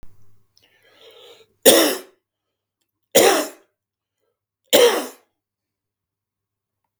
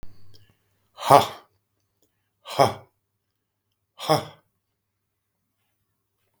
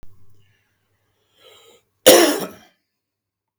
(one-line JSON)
{"three_cough_length": "7.0 s", "three_cough_amplitude": 32768, "three_cough_signal_mean_std_ratio": 0.29, "exhalation_length": "6.4 s", "exhalation_amplitude": 32768, "exhalation_signal_mean_std_ratio": 0.21, "cough_length": "3.6 s", "cough_amplitude": 32767, "cough_signal_mean_std_ratio": 0.25, "survey_phase": "beta (2021-08-13 to 2022-03-07)", "age": "65+", "gender": "Male", "wearing_mask": "No", "symptom_headache": true, "smoker_status": "Current smoker (11 or more cigarettes per day)", "respiratory_condition_asthma": false, "respiratory_condition_other": false, "recruitment_source": "REACT", "submission_delay": "2 days", "covid_test_result": "Negative", "covid_test_method": "RT-qPCR"}